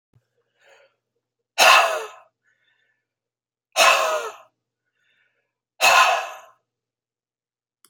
{"exhalation_length": "7.9 s", "exhalation_amplitude": 28466, "exhalation_signal_mean_std_ratio": 0.32, "survey_phase": "alpha (2021-03-01 to 2021-08-12)", "age": "45-64", "gender": "Male", "wearing_mask": "No", "symptom_none": true, "symptom_onset": "8 days", "smoker_status": "Never smoked", "respiratory_condition_asthma": true, "respiratory_condition_other": false, "recruitment_source": "REACT", "submission_delay": "2 days", "covid_test_result": "Negative", "covid_test_method": "RT-qPCR"}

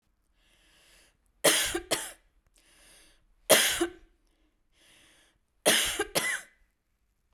{"three_cough_length": "7.3 s", "three_cough_amplitude": 19524, "three_cough_signal_mean_std_ratio": 0.34, "survey_phase": "beta (2021-08-13 to 2022-03-07)", "age": "45-64", "gender": "Female", "wearing_mask": "No", "symptom_cough_any": true, "smoker_status": "Ex-smoker", "respiratory_condition_asthma": false, "respiratory_condition_other": false, "recruitment_source": "REACT", "submission_delay": "1 day", "covid_test_result": "Negative", "covid_test_method": "RT-qPCR", "influenza_a_test_result": "Negative", "influenza_b_test_result": "Negative"}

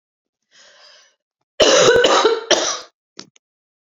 {"cough_length": "3.8 s", "cough_amplitude": 32767, "cough_signal_mean_std_ratio": 0.44, "survey_phase": "beta (2021-08-13 to 2022-03-07)", "age": "18-44", "gender": "Female", "wearing_mask": "No", "symptom_cough_any": true, "symptom_runny_or_blocked_nose": true, "symptom_fatigue": true, "symptom_headache": true, "symptom_change_to_sense_of_smell_or_taste": true, "symptom_onset": "12 days", "smoker_status": "Ex-smoker", "respiratory_condition_asthma": false, "respiratory_condition_other": false, "recruitment_source": "REACT", "submission_delay": "1 day", "covid_test_result": "Positive", "covid_test_method": "RT-qPCR", "covid_ct_value": 23.0, "covid_ct_gene": "E gene"}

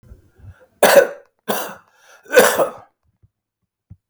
{"three_cough_length": "4.1 s", "three_cough_amplitude": 32768, "three_cough_signal_mean_std_ratio": 0.33, "survey_phase": "beta (2021-08-13 to 2022-03-07)", "age": "65+", "gender": "Male", "wearing_mask": "No", "symptom_cough_any": true, "symptom_runny_or_blocked_nose": true, "symptom_change_to_sense_of_smell_or_taste": true, "symptom_onset": "5 days", "smoker_status": "Ex-smoker", "respiratory_condition_asthma": false, "respiratory_condition_other": false, "recruitment_source": "REACT", "submission_delay": "2 days", "covid_test_result": "Negative", "covid_test_method": "RT-qPCR", "influenza_a_test_result": "Unknown/Void", "influenza_b_test_result": "Unknown/Void"}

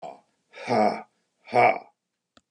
{"exhalation_length": "2.5 s", "exhalation_amplitude": 14110, "exhalation_signal_mean_std_ratio": 0.38, "survey_phase": "beta (2021-08-13 to 2022-03-07)", "age": "65+", "gender": "Male", "wearing_mask": "No", "symptom_none": true, "smoker_status": "Ex-smoker", "respiratory_condition_asthma": false, "respiratory_condition_other": false, "recruitment_source": "REACT", "submission_delay": "1 day", "covid_test_result": "Negative", "covid_test_method": "RT-qPCR", "influenza_a_test_result": "Negative", "influenza_b_test_result": "Negative"}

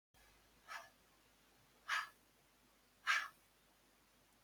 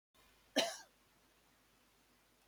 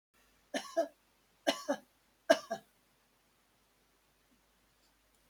{"exhalation_length": "4.4 s", "exhalation_amplitude": 2363, "exhalation_signal_mean_std_ratio": 0.29, "cough_length": "2.5 s", "cough_amplitude": 3566, "cough_signal_mean_std_ratio": 0.24, "three_cough_length": "5.3 s", "three_cough_amplitude": 9247, "three_cough_signal_mean_std_ratio": 0.22, "survey_phase": "beta (2021-08-13 to 2022-03-07)", "age": "65+", "gender": "Female", "wearing_mask": "No", "symptom_fatigue": true, "symptom_headache": true, "smoker_status": "Never smoked", "respiratory_condition_asthma": false, "respiratory_condition_other": false, "recruitment_source": "REACT", "submission_delay": "2 days", "covid_test_result": "Negative", "covid_test_method": "RT-qPCR", "influenza_a_test_result": "Negative", "influenza_b_test_result": "Negative"}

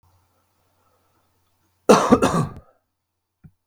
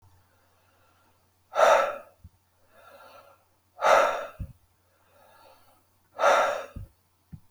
{"cough_length": "3.7 s", "cough_amplitude": 32768, "cough_signal_mean_std_ratio": 0.27, "exhalation_length": "7.5 s", "exhalation_amplitude": 16993, "exhalation_signal_mean_std_ratio": 0.34, "survey_phase": "beta (2021-08-13 to 2022-03-07)", "age": "18-44", "gender": "Male", "wearing_mask": "No", "symptom_none": true, "symptom_onset": "8 days", "smoker_status": "Never smoked", "respiratory_condition_asthma": false, "respiratory_condition_other": false, "recruitment_source": "REACT", "submission_delay": "3 days", "covid_test_result": "Negative", "covid_test_method": "RT-qPCR"}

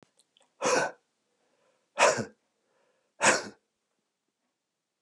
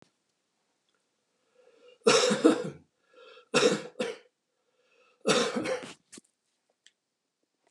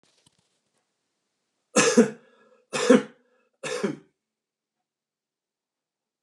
{"exhalation_length": "5.0 s", "exhalation_amplitude": 12545, "exhalation_signal_mean_std_ratio": 0.29, "three_cough_length": "7.7 s", "three_cough_amplitude": 15097, "three_cough_signal_mean_std_ratio": 0.33, "cough_length": "6.2 s", "cough_amplitude": 24054, "cough_signal_mean_std_ratio": 0.25, "survey_phase": "alpha (2021-03-01 to 2021-08-12)", "age": "65+", "gender": "Male", "wearing_mask": "No", "symptom_none": true, "smoker_status": "Ex-smoker", "respiratory_condition_asthma": false, "respiratory_condition_other": false, "recruitment_source": "REACT", "submission_delay": "2 days", "covid_test_result": "Negative", "covid_test_method": "RT-qPCR"}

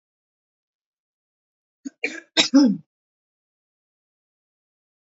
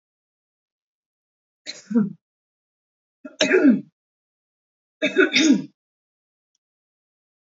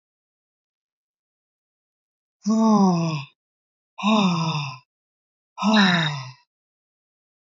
{"cough_length": "5.1 s", "cough_amplitude": 28669, "cough_signal_mean_std_ratio": 0.22, "three_cough_length": "7.5 s", "three_cough_amplitude": 24837, "three_cough_signal_mean_std_ratio": 0.3, "exhalation_length": "7.5 s", "exhalation_amplitude": 20559, "exhalation_signal_mean_std_ratio": 0.45, "survey_phase": "alpha (2021-03-01 to 2021-08-12)", "age": "18-44", "gender": "Female", "wearing_mask": "No", "symptom_cough_any": true, "symptom_fatigue": true, "symptom_headache": true, "smoker_status": "Never smoked", "respiratory_condition_asthma": false, "respiratory_condition_other": false, "recruitment_source": "Test and Trace", "submission_delay": "2 days", "covid_test_result": "Positive", "covid_test_method": "RT-qPCR", "covid_ct_value": 29.8, "covid_ct_gene": "N gene", "covid_ct_mean": 30.4, "covid_viral_load": "110 copies/ml", "covid_viral_load_category": "Minimal viral load (< 10K copies/ml)"}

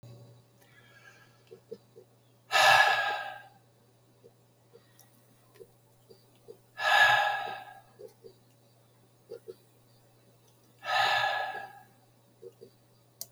{"exhalation_length": "13.3 s", "exhalation_amplitude": 11821, "exhalation_signal_mean_std_ratio": 0.34, "survey_phase": "beta (2021-08-13 to 2022-03-07)", "age": "65+", "gender": "Male", "wearing_mask": "No", "symptom_cough_any": true, "symptom_fatigue": true, "symptom_other": true, "symptom_onset": "12 days", "smoker_status": "Ex-smoker", "respiratory_condition_asthma": true, "respiratory_condition_other": true, "recruitment_source": "REACT", "submission_delay": "2 days", "covid_test_result": "Negative", "covid_test_method": "RT-qPCR", "influenza_a_test_result": "Negative", "influenza_b_test_result": "Negative"}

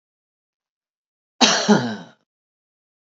{"cough_length": "3.2 s", "cough_amplitude": 31646, "cough_signal_mean_std_ratio": 0.29, "survey_phase": "beta (2021-08-13 to 2022-03-07)", "age": "45-64", "gender": "Male", "wearing_mask": "No", "symptom_none": true, "smoker_status": "Never smoked", "respiratory_condition_asthma": false, "respiratory_condition_other": false, "recruitment_source": "REACT", "submission_delay": "1 day", "covid_test_result": "Negative", "covid_test_method": "RT-qPCR", "influenza_a_test_result": "Negative", "influenza_b_test_result": "Negative"}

